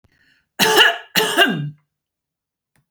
{"cough_length": "2.9 s", "cough_amplitude": 32767, "cough_signal_mean_std_ratio": 0.43, "survey_phase": "beta (2021-08-13 to 2022-03-07)", "age": "45-64", "gender": "Female", "wearing_mask": "No", "symptom_none": true, "smoker_status": "Never smoked", "respiratory_condition_asthma": false, "respiratory_condition_other": false, "recruitment_source": "REACT", "submission_delay": "2 days", "covid_test_result": "Negative", "covid_test_method": "RT-qPCR", "influenza_a_test_result": "Negative", "influenza_b_test_result": "Negative"}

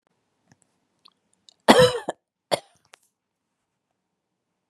{"cough_length": "4.7 s", "cough_amplitude": 32768, "cough_signal_mean_std_ratio": 0.2, "survey_phase": "beta (2021-08-13 to 2022-03-07)", "age": "45-64", "gender": "Female", "wearing_mask": "No", "symptom_none": true, "smoker_status": "Never smoked", "respiratory_condition_asthma": false, "respiratory_condition_other": false, "recruitment_source": "REACT", "submission_delay": "2 days", "covid_test_result": "Negative", "covid_test_method": "RT-qPCR", "influenza_a_test_result": "Negative", "influenza_b_test_result": "Negative"}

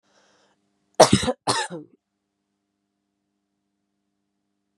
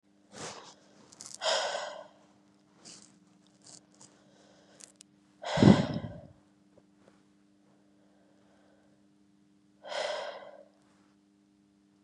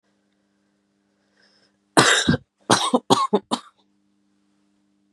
{"cough_length": "4.8 s", "cough_amplitude": 32767, "cough_signal_mean_std_ratio": 0.2, "exhalation_length": "12.0 s", "exhalation_amplitude": 16386, "exhalation_signal_mean_std_ratio": 0.24, "three_cough_length": "5.1 s", "three_cough_amplitude": 32767, "three_cough_signal_mean_std_ratio": 0.32, "survey_phase": "beta (2021-08-13 to 2022-03-07)", "age": "18-44", "gender": "Female", "wearing_mask": "No", "symptom_cough_any": true, "symptom_new_continuous_cough": true, "symptom_runny_or_blocked_nose": true, "symptom_fatigue": true, "symptom_headache": true, "symptom_change_to_sense_of_smell_or_taste": true, "symptom_loss_of_taste": true, "symptom_onset": "4 days", "smoker_status": "Never smoked", "respiratory_condition_asthma": false, "respiratory_condition_other": false, "recruitment_source": "Test and Trace", "submission_delay": "1 day", "covid_test_result": "Positive", "covid_test_method": "RT-qPCR", "covid_ct_value": 16.2, "covid_ct_gene": "N gene", "covid_ct_mean": 16.5, "covid_viral_load": "4000000 copies/ml", "covid_viral_load_category": "High viral load (>1M copies/ml)"}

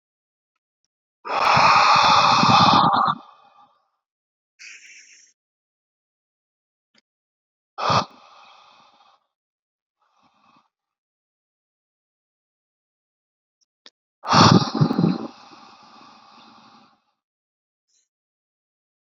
{"exhalation_length": "19.1 s", "exhalation_amplitude": 30740, "exhalation_signal_mean_std_ratio": 0.32, "survey_phase": "beta (2021-08-13 to 2022-03-07)", "age": "18-44", "gender": "Male", "wearing_mask": "No", "symptom_none": true, "smoker_status": "Current smoker (1 to 10 cigarettes per day)", "respiratory_condition_asthma": false, "respiratory_condition_other": false, "recruitment_source": "REACT", "submission_delay": "1 day", "covid_test_result": "Negative", "covid_test_method": "RT-qPCR", "influenza_a_test_result": "Unknown/Void", "influenza_b_test_result": "Unknown/Void"}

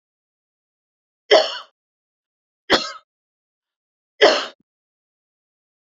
{"three_cough_length": "5.9 s", "three_cough_amplitude": 32768, "three_cough_signal_mean_std_ratio": 0.23, "survey_phase": "alpha (2021-03-01 to 2021-08-12)", "age": "45-64", "gender": "Female", "wearing_mask": "No", "symptom_none": true, "symptom_onset": "12 days", "smoker_status": "Ex-smoker", "respiratory_condition_asthma": false, "respiratory_condition_other": false, "recruitment_source": "REACT", "submission_delay": "4 days", "covid_test_result": "Negative", "covid_test_method": "RT-qPCR"}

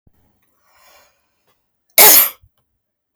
{"cough_length": "3.2 s", "cough_amplitude": 32768, "cough_signal_mean_std_ratio": 0.26, "survey_phase": "beta (2021-08-13 to 2022-03-07)", "age": "45-64", "gender": "Female", "wearing_mask": "No", "symptom_runny_or_blocked_nose": true, "symptom_sore_throat": true, "symptom_fatigue": true, "smoker_status": "Current smoker (11 or more cigarettes per day)", "respiratory_condition_asthma": false, "respiratory_condition_other": false, "recruitment_source": "REACT", "submission_delay": "3 days", "covid_test_result": "Negative", "covid_test_method": "RT-qPCR"}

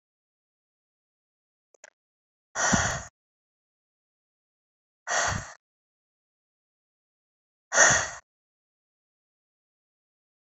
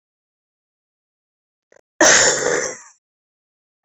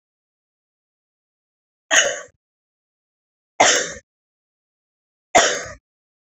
{"exhalation_length": "10.4 s", "exhalation_amplitude": 21821, "exhalation_signal_mean_std_ratio": 0.24, "cough_length": "3.8 s", "cough_amplitude": 30895, "cough_signal_mean_std_ratio": 0.32, "three_cough_length": "6.3 s", "three_cough_amplitude": 30439, "three_cough_signal_mean_std_ratio": 0.27, "survey_phase": "beta (2021-08-13 to 2022-03-07)", "age": "45-64", "gender": "Female", "wearing_mask": "No", "symptom_cough_any": true, "symptom_runny_or_blocked_nose": true, "symptom_shortness_of_breath": true, "symptom_sore_throat": true, "symptom_fatigue": true, "symptom_headache": true, "symptom_change_to_sense_of_smell_or_taste": true, "smoker_status": "Never smoked", "respiratory_condition_asthma": true, "respiratory_condition_other": false, "recruitment_source": "Test and Trace", "submission_delay": "1 day", "covid_test_result": "Positive", "covid_test_method": "RT-qPCR"}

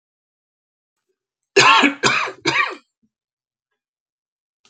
{"cough_length": "4.7 s", "cough_amplitude": 32768, "cough_signal_mean_std_ratio": 0.33, "survey_phase": "alpha (2021-03-01 to 2021-08-12)", "age": "65+", "gender": "Male", "wearing_mask": "No", "symptom_none": true, "smoker_status": "Ex-smoker", "respiratory_condition_asthma": false, "respiratory_condition_other": false, "recruitment_source": "REACT", "submission_delay": "2 days", "covid_test_result": "Negative", "covid_test_method": "RT-qPCR"}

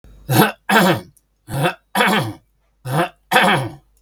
{"three_cough_length": "4.0 s", "three_cough_amplitude": 32768, "three_cough_signal_mean_std_ratio": 0.55, "survey_phase": "beta (2021-08-13 to 2022-03-07)", "age": "65+", "gender": "Male", "wearing_mask": "No", "symptom_none": true, "smoker_status": "Never smoked", "respiratory_condition_asthma": false, "respiratory_condition_other": true, "recruitment_source": "REACT", "submission_delay": "2 days", "covid_test_result": "Negative", "covid_test_method": "RT-qPCR", "influenza_a_test_result": "Negative", "influenza_b_test_result": "Negative"}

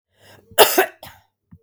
{"cough_length": "1.6 s", "cough_amplitude": 32768, "cough_signal_mean_std_ratio": 0.3, "survey_phase": "beta (2021-08-13 to 2022-03-07)", "age": "45-64", "gender": "Female", "wearing_mask": "No", "symptom_none": true, "smoker_status": "Never smoked", "respiratory_condition_asthma": true, "respiratory_condition_other": false, "recruitment_source": "REACT", "submission_delay": "2 days", "covid_test_result": "Negative", "covid_test_method": "RT-qPCR", "influenza_a_test_result": "Negative", "influenza_b_test_result": "Negative"}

